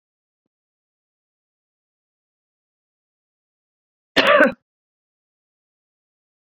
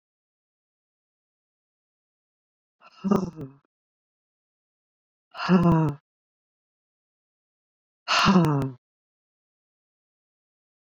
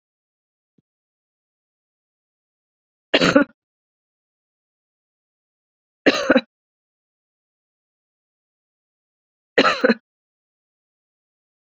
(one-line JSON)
{"cough_length": "6.6 s", "cough_amplitude": 26831, "cough_signal_mean_std_ratio": 0.18, "exhalation_length": "10.8 s", "exhalation_amplitude": 16463, "exhalation_signal_mean_std_ratio": 0.29, "three_cough_length": "11.8 s", "three_cough_amplitude": 30660, "three_cough_signal_mean_std_ratio": 0.19, "survey_phase": "beta (2021-08-13 to 2022-03-07)", "age": "45-64", "gender": "Female", "wearing_mask": "No", "symptom_cough_any": true, "symptom_runny_or_blocked_nose": true, "symptom_sore_throat": true, "symptom_onset": "2 days", "smoker_status": "Ex-smoker", "respiratory_condition_asthma": false, "respiratory_condition_other": false, "recruitment_source": "Test and Trace", "submission_delay": "1 day", "covid_test_result": "Positive", "covid_test_method": "RT-qPCR", "covid_ct_value": 19.2, "covid_ct_gene": "N gene", "covid_ct_mean": 20.1, "covid_viral_load": "250000 copies/ml", "covid_viral_load_category": "Low viral load (10K-1M copies/ml)"}